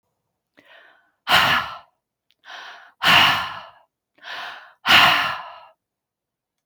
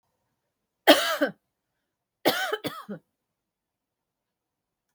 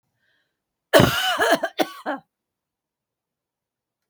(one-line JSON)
{"exhalation_length": "6.7 s", "exhalation_amplitude": 29048, "exhalation_signal_mean_std_ratio": 0.38, "three_cough_length": "4.9 s", "three_cough_amplitude": 28755, "three_cough_signal_mean_std_ratio": 0.26, "cough_length": "4.1 s", "cough_amplitude": 30347, "cough_signal_mean_std_ratio": 0.33, "survey_phase": "alpha (2021-03-01 to 2021-08-12)", "age": "45-64", "gender": "Female", "wearing_mask": "No", "symptom_none": true, "smoker_status": "Ex-smoker", "respiratory_condition_asthma": false, "respiratory_condition_other": false, "recruitment_source": "REACT", "submission_delay": "1 day", "covid_test_result": "Negative", "covid_test_method": "RT-qPCR"}